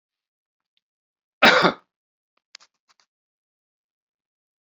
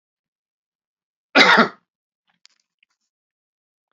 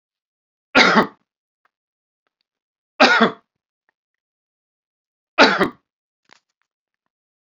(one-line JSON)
{"exhalation_length": "4.7 s", "exhalation_amplitude": 28516, "exhalation_signal_mean_std_ratio": 0.19, "cough_length": "3.9 s", "cough_amplitude": 29403, "cough_signal_mean_std_ratio": 0.22, "three_cough_length": "7.6 s", "three_cough_amplitude": 29565, "three_cough_signal_mean_std_ratio": 0.26, "survey_phase": "beta (2021-08-13 to 2022-03-07)", "age": "45-64", "gender": "Male", "wearing_mask": "No", "symptom_none": true, "smoker_status": "Never smoked", "respiratory_condition_asthma": false, "respiratory_condition_other": false, "recruitment_source": "REACT", "submission_delay": "1 day", "covid_test_result": "Negative", "covid_test_method": "RT-qPCR", "influenza_a_test_result": "Negative", "influenza_b_test_result": "Negative"}